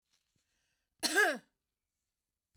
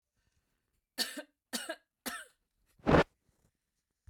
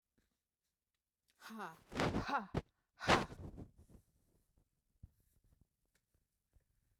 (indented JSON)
{
  "cough_length": "2.6 s",
  "cough_amplitude": 6055,
  "cough_signal_mean_std_ratio": 0.27,
  "three_cough_length": "4.1 s",
  "three_cough_amplitude": 9161,
  "three_cough_signal_mean_std_ratio": 0.24,
  "exhalation_length": "7.0 s",
  "exhalation_amplitude": 5265,
  "exhalation_signal_mean_std_ratio": 0.28,
  "survey_phase": "beta (2021-08-13 to 2022-03-07)",
  "age": "65+",
  "gender": "Female",
  "wearing_mask": "No",
  "symptom_runny_or_blocked_nose": true,
  "symptom_fatigue": true,
  "smoker_status": "Never smoked",
  "respiratory_condition_asthma": false,
  "respiratory_condition_other": false,
  "recruitment_source": "REACT",
  "submission_delay": "1 day",
  "covid_test_result": "Negative",
  "covid_test_method": "RT-qPCR",
  "influenza_a_test_result": "Negative",
  "influenza_b_test_result": "Negative"
}